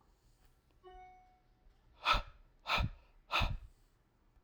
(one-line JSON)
{"exhalation_length": "4.4 s", "exhalation_amplitude": 5676, "exhalation_signal_mean_std_ratio": 0.35, "survey_phase": "alpha (2021-03-01 to 2021-08-12)", "age": "45-64", "gender": "Male", "wearing_mask": "No", "symptom_none": true, "smoker_status": "Ex-smoker", "respiratory_condition_asthma": false, "respiratory_condition_other": false, "recruitment_source": "REACT", "submission_delay": "1 day", "covid_test_result": "Negative", "covid_test_method": "RT-qPCR"}